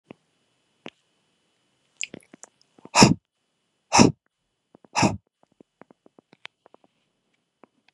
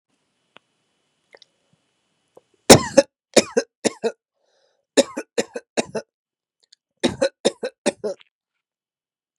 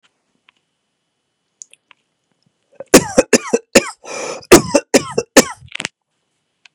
{"exhalation_length": "7.9 s", "exhalation_amplitude": 32767, "exhalation_signal_mean_std_ratio": 0.19, "three_cough_length": "9.4 s", "three_cough_amplitude": 32768, "three_cough_signal_mean_std_ratio": 0.22, "cough_length": "6.7 s", "cough_amplitude": 32768, "cough_signal_mean_std_ratio": 0.27, "survey_phase": "beta (2021-08-13 to 2022-03-07)", "age": "18-44", "gender": "Male", "wearing_mask": "No", "symptom_other": true, "symptom_onset": "3 days", "smoker_status": "Current smoker (1 to 10 cigarettes per day)", "respiratory_condition_asthma": false, "respiratory_condition_other": false, "recruitment_source": "Test and Trace", "submission_delay": "2 days", "covid_test_result": "Positive", "covid_test_method": "RT-qPCR", "covid_ct_value": 18.5, "covid_ct_gene": "N gene"}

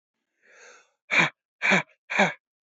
{"exhalation_length": "2.6 s", "exhalation_amplitude": 15704, "exhalation_signal_mean_std_ratio": 0.37, "survey_phase": "beta (2021-08-13 to 2022-03-07)", "age": "18-44", "gender": "Male", "wearing_mask": "No", "symptom_none": true, "smoker_status": "Never smoked", "respiratory_condition_asthma": true, "respiratory_condition_other": false, "recruitment_source": "REACT", "submission_delay": "1 day", "covid_test_result": "Negative", "covid_test_method": "RT-qPCR", "influenza_a_test_result": "Negative", "influenza_b_test_result": "Negative"}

